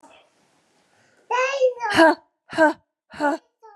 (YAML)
exhalation_length: 3.8 s
exhalation_amplitude: 24260
exhalation_signal_mean_std_ratio: 0.42
survey_phase: beta (2021-08-13 to 2022-03-07)
age: 18-44
gender: Female
wearing_mask: 'No'
symptom_runny_or_blocked_nose: true
smoker_status: Never smoked
respiratory_condition_asthma: false
respiratory_condition_other: false
recruitment_source: REACT
submission_delay: 2 days
covid_test_result: Negative
covid_test_method: RT-qPCR